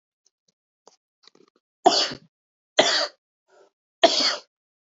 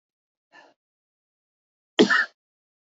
{"three_cough_length": "4.9 s", "three_cough_amplitude": 26216, "three_cough_signal_mean_std_ratio": 0.3, "cough_length": "2.9 s", "cough_amplitude": 22652, "cough_signal_mean_std_ratio": 0.22, "survey_phase": "beta (2021-08-13 to 2022-03-07)", "age": "18-44", "gender": "Male", "wearing_mask": "No", "symptom_none": true, "smoker_status": "Current smoker (e-cigarettes or vapes only)", "respiratory_condition_asthma": true, "respiratory_condition_other": false, "recruitment_source": "REACT", "submission_delay": "4 days", "covid_test_result": "Negative", "covid_test_method": "RT-qPCR", "influenza_a_test_result": "Negative", "influenza_b_test_result": "Negative"}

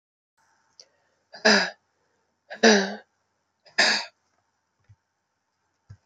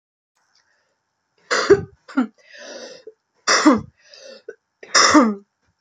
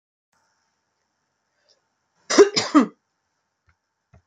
{"exhalation_length": "6.1 s", "exhalation_amplitude": 21945, "exhalation_signal_mean_std_ratio": 0.27, "three_cough_length": "5.8 s", "three_cough_amplitude": 32768, "three_cough_signal_mean_std_ratio": 0.36, "cough_length": "4.3 s", "cough_amplitude": 27536, "cough_signal_mean_std_ratio": 0.22, "survey_phase": "beta (2021-08-13 to 2022-03-07)", "age": "18-44", "gender": "Female", "wearing_mask": "No", "symptom_cough_any": true, "symptom_runny_or_blocked_nose": true, "symptom_fatigue": true, "symptom_change_to_sense_of_smell_or_taste": true, "symptom_onset": "3 days", "smoker_status": "Never smoked", "respiratory_condition_asthma": true, "respiratory_condition_other": false, "recruitment_source": "Test and Trace", "submission_delay": "2 days", "covid_test_result": "Positive", "covid_test_method": "RT-qPCR", "covid_ct_value": 18.1, "covid_ct_gene": "ORF1ab gene", "covid_ct_mean": 18.3, "covid_viral_load": "970000 copies/ml", "covid_viral_load_category": "Low viral load (10K-1M copies/ml)"}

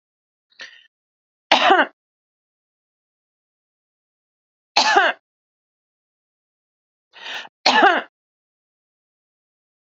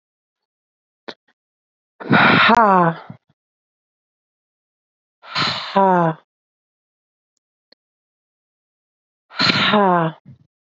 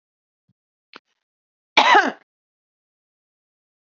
{"three_cough_length": "10.0 s", "three_cough_amplitude": 30058, "three_cough_signal_mean_std_ratio": 0.25, "exhalation_length": "10.8 s", "exhalation_amplitude": 29479, "exhalation_signal_mean_std_ratio": 0.35, "cough_length": "3.8 s", "cough_amplitude": 31702, "cough_signal_mean_std_ratio": 0.22, "survey_phase": "beta (2021-08-13 to 2022-03-07)", "age": "45-64", "gender": "Female", "wearing_mask": "No", "symptom_none": true, "smoker_status": "Ex-smoker", "respiratory_condition_asthma": false, "respiratory_condition_other": false, "recruitment_source": "REACT", "submission_delay": "0 days", "covid_test_result": "Negative", "covid_test_method": "RT-qPCR", "influenza_a_test_result": "Negative", "influenza_b_test_result": "Negative"}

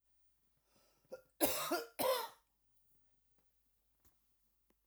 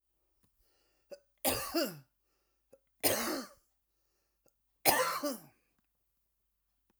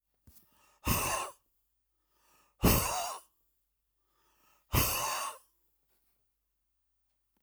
{"cough_length": "4.9 s", "cough_amplitude": 6049, "cough_signal_mean_std_ratio": 0.32, "three_cough_length": "7.0 s", "three_cough_amplitude": 9641, "three_cough_signal_mean_std_ratio": 0.33, "exhalation_length": "7.4 s", "exhalation_amplitude": 8921, "exhalation_signal_mean_std_ratio": 0.34, "survey_phase": "alpha (2021-03-01 to 2021-08-12)", "age": "45-64", "gender": "Female", "wearing_mask": "No", "symptom_none": true, "smoker_status": "Ex-smoker", "respiratory_condition_asthma": false, "respiratory_condition_other": false, "recruitment_source": "REACT", "submission_delay": "2 days", "covid_test_result": "Negative", "covid_test_method": "RT-qPCR"}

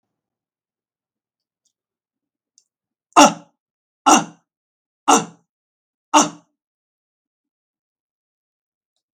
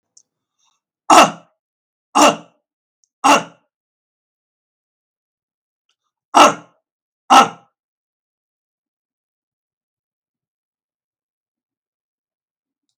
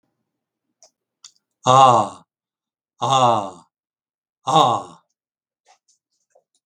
{"three_cough_length": "9.1 s", "three_cough_amplitude": 32768, "three_cough_signal_mean_std_ratio": 0.2, "cough_length": "13.0 s", "cough_amplitude": 32768, "cough_signal_mean_std_ratio": 0.21, "exhalation_length": "6.7 s", "exhalation_amplitude": 32766, "exhalation_signal_mean_std_ratio": 0.32, "survey_phase": "beta (2021-08-13 to 2022-03-07)", "age": "65+", "gender": "Male", "wearing_mask": "No", "symptom_none": true, "smoker_status": "Ex-smoker", "respiratory_condition_asthma": false, "respiratory_condition_other": false, "recruitment_source": "REACT", "submission_delay": "5 days", "covid_test_result": "Negative", "covid_test_method": "RT-qPCR"}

